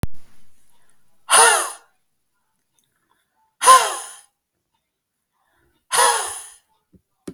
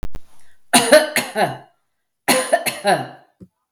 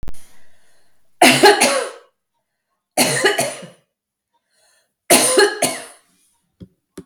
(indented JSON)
{
  "exhalation_length": "7.3 s",
  "exhalation_amplitude": 32768,
  "exhalation_signal_mean_std_ratio": 0.33,
  "cough_length": "3.7 s",
  "cough_amplitude": 32768,
  "cough_signal_mean_std_ratio": 0.5,
  "three_cough_length": "7.1 s",
  "three_cough_amplitude": 32768,
  "three_cough_signal_mean_std_ratio": 0.42,
  "survey_phase": "beta (2021-08-13 to 2022-03-07)",
  "age": "45-64",
  "gender": "Female",
  "wearing_mask": "No",
  "symptom_none": true,
  "smoker_status": "Ex-smoker",
  "respiratory_condition_asthma": false,
  "respiratory_condition_other": false,
  "recruitment_source": "REACT",
  "submission_delay": "8 days",
  "covid_test_result": "Negative",
  "covid_test_method": "RT-qPCR",
  "influenza_a_test_result": "Negative",
  "influenza_b_test_result": "Negative"
}